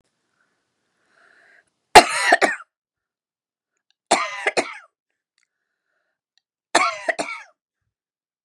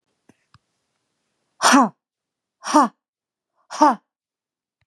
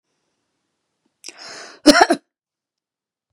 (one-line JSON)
{"three_cough_length": "8.4 s", "three_cough_amplitude": 32768, "three_cough_signal_mean_std_ratio": 0.24, "exhalation_length": "4.9 s", "exhalation_amplitude": 27571, "exhalation_signal_mean_std_ratio": 0.28, "cough_length": "3.3 s", "cough_amplitude": 32768, "cough_signal_mean_std_ratio": 0.22, "survey_phase": "beta (2021-08-13 to 2022-03-07)", "age": "45-64", "gender": "Female", "wearing_mask": "No", "symptom_fatigue": true, "symptom_other": true, "symptom_onset": "6 days", "smoker_status": "Never smoked", "respiratory_condition_asthma": true, "respiratory_condition_other": false, "recruitment_source": "REACT", "submission_delay": "1 day", "covid_test_method": "RT-qPCR", "influenza_a_test_result": "Unknown/Void", "influenza_b_test_result": "Unknown/Void"}